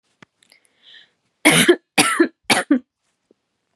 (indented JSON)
{
  "three_cough_length": "3.8 s",
  "three_cough_amplitude": 32767,
  "three_cough_signal_mean_std_ratio": 0.36,
  "survey_phase": "beta (2021-08-13 to 2022-03-07)",
  "age": "18-44",
  "gender": "Female",
  "wearing_mask": "No",
  "symptom_none": true,
  "symptom_onset": "8 days",
  "smoker_status": "Never smoked",
  "respiratory_condition_asthma": false,
  "respiratory_condition_other": false,
  "recruitment_source": "REACT",
  "submission_delay": "4 days",
  "covid_test_result": "Negative",
  "covid_test_method": "RT-qPCR",
  "influenza_a_test_result": "Negative",
  "influenza_b_test_result": "Negative"
}